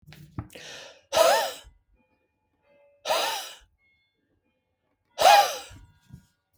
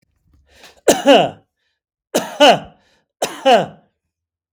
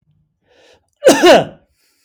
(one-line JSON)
{"exhalation_length": "6.6 s", "exhalation_amplitude": 18873, "exhalation_signal_mean_std_ratio": 0.32, "three_cough_length": "4.5 s", "three_cough_amplitude": 32768, "three_cough_signal_mean_std_ratio": 0.36, "cough_length": "2.0 s", "cough_amplitude": 32768, "cough_signal_mean_std_ratio": 0.37, "survey_phase": "beta (2021-08-13 to 2022-03-07)", "age": "65+", "gender": "Male", "wearing_mask": "No", "symptom_runny_or_blocked_nose": true, "symptom_onset": "12 days", "smoker_status": "Never smoked", "respiratory_condition_asthma": false, "respiratory_condition_other": false, "recruitment_source": "REACT", "submission_delay": "2 days", "covid_test_result": "Negative", "covid_test_method": "RT-qPCR", "influenza_a_test_result": "Negative", "influenza_b_test_result": "Negative"}